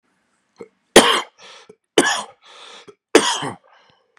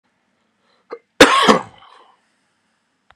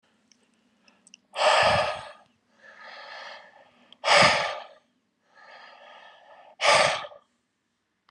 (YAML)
three_cough_length: 4.2 s
three_cough_amplitude: 32768
three_cough_signal_mean_std_ratio: 0.31
cough_length: 3.2 s
cough_amplitude: 32768
cough_signal_mean_std_ratio: 0.27
exhalation_length: 8.1 s
exhalation_amplitude: 20665
exhalation_signal_mean_std_ratio: 0.37
survey_phase: beta (2021-08-13 to 2022-03-07)
age: 18-44
gender: Male
wearing_mask: 'No'
symptom_runny_or_blocked_nose: true
symptom_shortness_of_breath: true
symptom_fatigue: true
symptom_headache: true
smoker_status: Never smoked
respiratory_condition_asthma: false
respiratory_condition_other: false
recruitment_source: Test and Trace
submission_delay: 2 days
covid_test_result: Positive
covid_test_method: RT-qPCR
covid_ct_value: 31.8
covid_ct_gene: ORF1ab gene
covid_ct_mean: 32.0
covid_viral_load: 32 copies/ml
covid_viral_load_category: Minimal viral load (< 10K copies/ml)